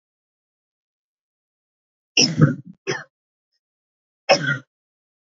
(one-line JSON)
{"cough_length": "5.2 s", "cough_amplitude": 27563, "cough_signal_mean_std_ratio": 0.26, "survey_phase": "alpha (2021-03-01 to 2021-08-12)", "age": "18-44", "gender": "Female", "wearing_mask": "No", "symptom_cough_any": true, "symptom_fatigue": true, "symptom_headache": true, "symptom_onset": "3 days", "smoker_status": "Never smoked", "respiratory_condition_asthma": false, "respiratory_condition_other": false, "recruitment_source": "Test and Trace", "submission_delay": "1 day", "covid_test_result": "Positive", "covid_test_method": "RT-qPCR"}